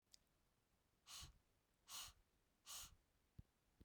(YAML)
exhalation_length: 3.8 s
exhalation_amplitude: 270
exhalation_signal_mean_std_ratio: 0.43
survey_phase: beta (2021-08-13 to 2022-03-07)
age: 18-44
gender: Female
wearing_mask: 'No'
symptom_none: true
symptom_onset: 13 days
smoker_status: Never smoked
respiratory_condition_asthma: false
respiratory_condition_other: false
recruitment_source: REACT
submission_delay: 1 day
covid_test_result: Negative
covid_test_method: RT-qPCR
influenza_a_test_result: Negative
influenza_b_test_result: Negative